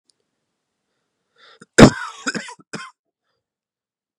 cough_length: 4.2 s
cough_amplitude: 32768
cough_signal_mean_std_ratio: 0.18
survey_phase: beta (2021-08-13 to 2022-03-07)
age: 18-44
gender: Male
wearing_mask: 'No'
symptom_cough_any: true
symptom_new_continuous_cough: true
symptom_runny_or_blocked_nose: true
symptom_onset: 3 days
smoker_status: Ex-smoker
respiratory_condition_asthma: false
respiratory_condition_other: false
recruitment_source: Test and Trace
submission_delay: 2 days
covid_test_result: Positive
covid_test_method: RT-qPCR
covid_ct_value: 18.7
covid_ct_gene: ORF1ab gene
covid_ct_mean: 19.2
covid_viral_load: 500000 copies/ml
covid_viral_load_category: Low viral load (10K-1M copies/ml)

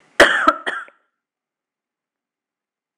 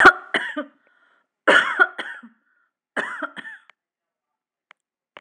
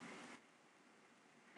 cough_length: 3.0 s
cough_amplitude: 26028
cough_signal_mean_std_ratio: 0.27
three_cough_length: 5.2 s
three_cough_amplitude: 26028
three_cough_signal_mean_std_ratio: 0.29
exhalation_length: 1.6 s
exhalation_amplitude: 18964
exhalation_signal_mean_std_ratio: 0.1
survey_phase: alpha (2021-03-01 to 2021-08-12)
age: 45-64
gender: Female
wearing_mask: 'Yes'
symptom_none: true
smoker_status: Ex-smoker
respiratory_condition_asthma: false
respiratory_condition_other: false
recruitment_source: Test and Trace
submission_delay: 0 days
covid_test_result: Negative
covid_test_method: LFT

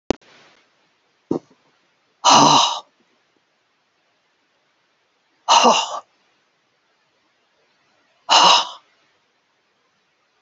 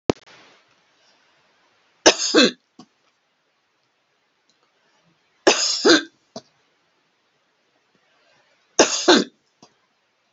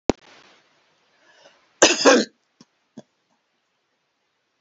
exhalation_length: 10.4 s
exhalation_amplitude: 32768
exhalation_signal_mean_std_ratio: 0.29
three_cough_length: 10.3 s
three_cough_amplitude: 32768
three_cough_signal_mean_std_ratio: 0.26
cough_length: 4.6 s
cough_amplitude: 31423
cough_signal_mean_std_ratio: 0.23
survey_phase: beta (2021-08-13 to 2022-03-07)
age: 65+
gender: Female
wearing_mask: 'No'
symptom_none: true
smoker_status: Never smoked
respiratory_condition_asthma: false
respiratory_condition_other: false
recruitment_source: REACT
submission_delay: 1 day
covid_test_result: Negative
covid_test_method: RT-qPCR
influenza_a_test_result: Negative
influenza_b_test_result: Negative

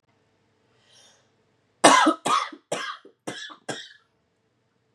cough_length: 4.9 s
cough_amplitude: 32166
cough_signal_mean_std_ratio: 0.29
survey_phase: beta (2021-08-13 to 2022-03-07)
age: 18-44
gender: Female
wearing_mask: 'No'
symptom_cough_any: true
symptom_runny_or_blocked_nose: true
symptom_shortness_of_breath: true
symptom_sore_throat: true
symptom_abdominal_pain: true
symptom_diarrhoea: true
symptom_fatigue: true
symptom_fever_high_temperature: true
symptom_headache: true
symptom_change_to_sense_of_smell_or_taste: true
symptom_loss_of_taste: true
symptom_other: true
symptom_onset: 2 days
smoker_status: Never smoked
respiratory_condition_asthma: false
respiratory_condition_other: false
recruitment_source: Test and Trace
submission_delay: 2 days
covid_test_result: Positive
covid_test_method: RT-qPCR
covid_ct_value: 17.6
covid_ct_gene: N gene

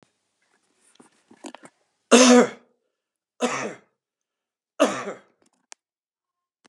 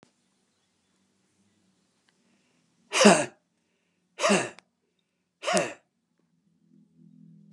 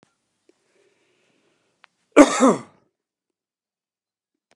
three_cough_length: 6.7 s
three_cough_amplitude: 30416
three_cough_signal_mean_std_ratio: 0.25
exhalation_length: 7.5 s
exhalation_amplitude: 23913
exhalation_signal_mean_std_ratio: 0.24
cough_length: 4.6 s
cough_amplitude: 32768
cough_signal_mean_std_ratio: 0.19
survey_phase: beta (2021-08-13 to 2022-03-07)
age: 65+
gender: Male
wearing_mask: 'No'
symptom_none: true
smoker_status: Ex-smoker
respiratory_condition_asthma: false
respiratory_condition_other: false
recruitment_source: REACT
submission_delay: 3 days
covid_test_result: Negative
covid_test_method: RT-qPCR
influenza_a_test_result: Negative
influenza_b_test_result: Negative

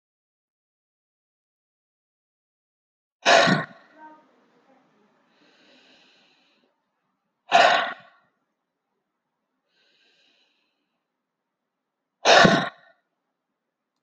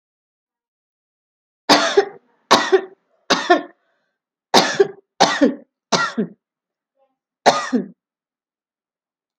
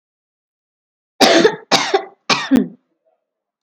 exhalation_length: 14.0 s
exhalation_amplitude: 27603
exhalation_signal_mean_std_ratio: 0.22
three_cough_length: 9.4 s
three_cough_amplitude: 31359
three_cough_signal_mean_std_ratio: 0.34
cough_length: 3.6 s
cough_amplitude: 30979
cough_signal_mean_std_ratio: 0.39
survey_phase: alpha (2021-03-01 to 2021-08-12)
age: 45-64
gender: Female
wearing_mask: 'Yes'
symptom_none: true
smoker_status: Never smoked
respiratory_condition_asthma: false
respiratory_condition_other: false
recruitment_source: REACT
submission_delay: 5 days
covid_test_result: Negative
covid_test_method: RT-qPCR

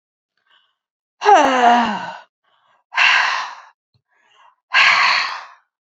exhalation_length: 6.0 s
exhalation_amplitude: 28947
exhalation_signal_mean_std_ratio: 0.47
survey_phase: beta (2021-08-13 to 2022-03-07)
age: 65+
gender: Female
wearing_mask: 'No'
symptom_cough_any: true
symptom_sore_throat: true
symptom_onset: 5 days
smoker_status: Never smoked
respiratory_condition_asthma: false
respiratory_condition_other: false
recruitment_source: Test and Trace
submission_delay: 3 days
covid_test_result: Positive
covid_test_method: ePCR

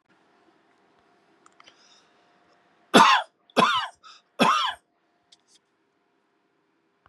three_cough_length: 7.1 s
three_cough_amplitude: 30857
three_cough_signal_mean_std_ratio: 0.27
survey_phase: beta (2021-08-13 to 2022-03-07)
age: 45-64
gender: Male
wearing_mask: 'No'
symptom_none: true
smoker_status: Ex-smoker
respiratory_condition_asthma: false
respiratory_condition_other: false
recruitment_source: REACT
submission_delay: 2 days
covid_test_result: Negative
covid_test_method: RT-qPCR
influenza_a_test_result: Negative
influenza_b_test_result: Negative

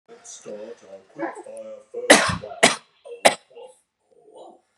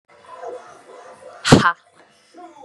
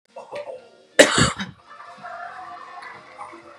three_cough_length: 4.8 s
three_cough_amplitude: 32768
three_cough_signal_mean_std_ratio: 0.3
exhalation_length: 2.6 s
exhalation_amplitude: 32768
exhalation_signal_mean_std_ratio: 0.28
cough_length: 3.6 s
cough_amplitude: 32768
cough_signal_mean_std_ratio: 0.33
survey_phase: beta (2021-08-13 to 2022-03-07)
age: 18-44
gender: Female
wearing_mask: 'No'
symptom_runny_or_blocked_nose: true
symptom_sore_throat: true
smoker_status: Never smoked
respiratory_condition_asthma: false
respiratory_condition_other: false
recruitment_source: REACT
submission_delay: 6 days
covid_test_result: Negative
covid_test_method: RT-qPCR
influenza_a_test_result: Negative
influenza_b_test_result: Negative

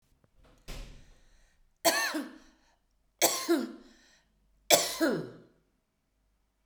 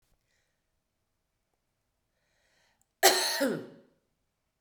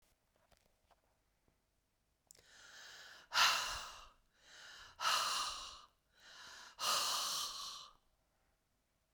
three_cough_length: 6.7 s
three_cough_amplitude: 16041
three_cough_signal_mean_std_ratio: 0.35
cough_length: 4.6 s
cough_amplitude: 16314
cough_signal_mean_std_ratio: 0.25
exhalation_length: 9.1 s
exhalation_amplitude: 3682
exhalation_signal_mean_std_ratio: 0.41
survey_phase: beta (2021-08-13 to 2022-03-07)
age: 45-64
gender: Female
wearing_mask: 'No'
symptom_none: true
smoker_status: Ex-smoker
respiratory_condition_asthma: false
respiratory_condition_other: false
recruitment_source: REACT
submission_delay: 1 day
covid_test_result: Negative
covid_test_method: RT-qPCR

